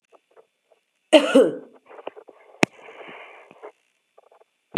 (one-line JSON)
{"cough_length": "4.8 s", "cough_amplitude": 32768, "cough_signal_mean_std_ratio": 0.23, "survey_phase": "beta (2021-08-13 to 2022-03-07)", "age": "45-64", "gender": "Female", "wearing_mask": "No", "symptom_cough_any": true, "symptom_runny_or_blocked_nose": true, "symptom_shortness_of_breath": true, "symptom_fatigue": true, "symptom_headache": true, "symptom_change_to_sense_of_smell_or_taste": true, "symptom_onset": "3 days", "smoker_status": "Never smoked", "respiratory_condition_asthma": false, "respiratory_condition_other": false, "recruitment_source": "Test and Trace", "submission_delay": "1 day", "covid_test_result": "Positive", "covid_test_method": "RT-qPCR", "covid_ct_value": 27.7, "covid_ct_gene": "N gene"}